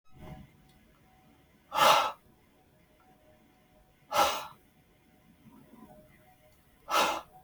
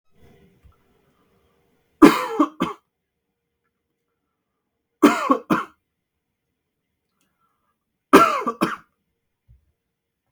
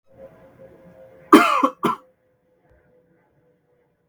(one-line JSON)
{"exhalation_length": "7.4 s", "exhalation_amplitude": 11057, "exhalation_signal_mean_std_ratio": 0.31, "three_cough_length": "10.3 s", "three_cough_amplitude": 32768, "three_cough_signal_mean_std_ratio": 0.24, "cough_length": "4.1 s", "cough_amplitude": 32767, "cough_signal_mean_std_ratio": 0.25, "survey_phase": "beta (2021-08-13 to 2022-03-07)", "age": "18-44", "gender": "Male", "wearing_mask": "No", "symptom_none": true, "smoker_status": "Never smoked", "respiratory_condition_asthma": false, "respiratory_condition_other": false, "recruitment_source": "REACT", "submission_delay": "5 days", "covid_test_result": "Negative", "covid_test_method": "RT-qPCR", "influenza_a_test_result": "Negative", "influenza_b_test_result": "Negative"}